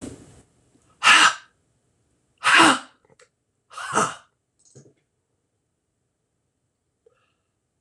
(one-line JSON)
{"exhalation_length": "7.8 s", "exhalation_amplitude": 26027, "exhalation_signal_mean_std_ratio": 0.26, "survey_phase": "beta (2021-08-13 to 2022-03-07)", "age": "65+", "gender": "Male", "wearing_mask": "No", "symptom_none": true, "smoker_status": "Never smoked", "respiratory_condition_asthma": false, "respiratory_condition_other": false, "recruitment_source": "REACT", "submission_delay": "2 days", "covid_test_result": "Negative", "covid_test_method": "RT-qPCR", "influenza_a_test_result": "Negative", "influenza_b_test_result": "Negative"}